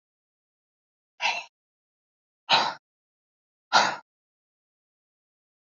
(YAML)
exhalation_length: 5.7 s
exhalation_amplitude: 18351
exhalation_signal_mean_std_ratio: 0.24
survey_phase: beta (2021-08-13 to 2022-03-07)
age: 45-64
gender: Female
wearing_mask: 'No'
symptom_none: true
smoker_status: Never smoked
respiratory_condition_asthma: false
respiratory_condition_other: false
recruitment_source: REACT
submission_delay: 1 day
covid_test_result: Negative
covid_test_method: RT-qPCR
influenza_a_test_result: Negative
influenza_b_test_result: Negative